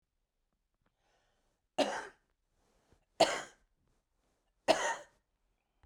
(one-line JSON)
{"three_cough_length": "5.9 s", "three_cough_amplitude": 7513, "three_cough_signal_mean_std_ratio": 0.24, "survey_phase": "beta (2021-08-13 to 2022-03-07)", "age": "45-64", "gender": "Female", "wearing_mask": "No", "symptom_none": true, "smoker_status": "Current smoker (11 or more cigarettes per day)", "respiratory_condition_asthma": false, "respiratory_condition_other": false, "recruitment_source": "REACT", "submission_delay": "1 day", "covid_test_result": "Negative", "covid_test_method": "RT-qPCR", "influenza_a_test_result": "Negative", "influenza_b_test_result": "Negative"}